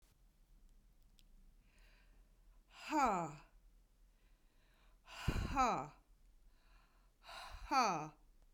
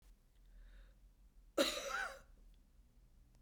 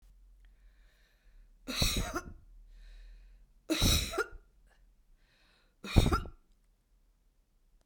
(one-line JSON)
{"exhalation_length": "8.5 s", "exhalation_amplitude": 2635, "exhalation_signal_mean_std_ratio": 0.38, "cough_length": "3.4 s", "cough_amplitude": 3016, "cough_signal_mean_std_ratio": 0.39, "three_cough_length": "7.9 s", "three_cough_amplitude": 13496, "three_cough_signal_mean_std_ratio": 0.34, "survey_phase": "beta (2021-08-13 to 2022-03-07)", "age": "65+", "gender": "Female", "wearing_mask": "No", "symptom_runny_or_blocked_nose": true, "smoker_status": "Never smoked", "respiratory_condition_asthma": false, "respiratory_condition_other": false, "recruitment_source": "Test and Trace", "submission_delay": "2 days", "covid_test_result": "Positive", "covid_test_method": "RT-qPCR", "covid_ct_value": 36.5, "covid_ct_gene": "ORF1ab gene"}